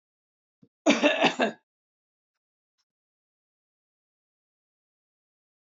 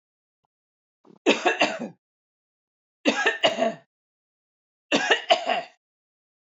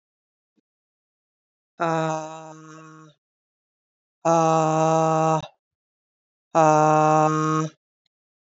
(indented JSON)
{
  "cough_length": "5.6 s",
  "cough_amplitude": 16343,
  "cough_signal_mean_std_ratio": 0.23,
  "three_cough_length": "6.6 s",
  "three_cough_amplitude": 21541,
  "three_cough_signal_mean_std_ratio": 0.37,
  "exhalation_length": "8.4 s",
  "exhalation_amplitude": 19876,
  "exhalation_signal_mean_std_ratio": 0.42,
  "survey_phase": "beta (2021-08-13 to 2022-03-07)",
  "age": "45-64",
  "gender": "Female",
  "wearing_mask": "No",
  "symptom_none": true,
  "smoker_status": "Never smoked",
  "respiratory_condition_asthma": false,
  "respiratory_condition_other": false,
  "recruitment_source": "REACT",
  "submission_delay": "4 days",
  "covid_test_result": "Negative",
  "covid_test_method": "RT-qPCR",
  "influenza_a_test_result": "Negative",
  "influenza_b_test_result": "Negative"
}